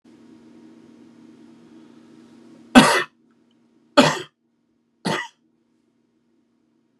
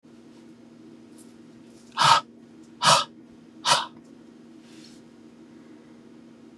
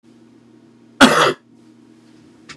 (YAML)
three_cough_length: 7.0 s
three_cough_amplitude: 32768
three_cough_signal_mean_std_ratio: 0.22
exhalation_length: 6.6 s
exhalation_amplitude: 21592
exhalation_signal_mean_std_ratio: 0.31
cough_length: 2.6 s
cough_amplitude: 32768
cough_signal_mean_std_ratio: 0.29
survey_phase: beta (2021-08-13 to 2022-03-07)
age: 45-64
gender: Male
wearing_mask: 'No'
symptom_cough_any: true
symptom_runny_or_blocked_nose: true
smoker_status: Never smoked
respiratory_condition_asthma: false
respiratory_condition_other: false
recruitment_source: Test and Trace
submission_delay: 2 days
covid_test_result: Positive
covid_test_method: RT-qPCR
covid_ct_value: 17.2
covid_ct_gene: ORF1ab gene
covid_ct_mean: 18.5
covid_viral_load: 830000 copies/ml
covid_viral_load_category: Low viral load (10K-1M copies/ml)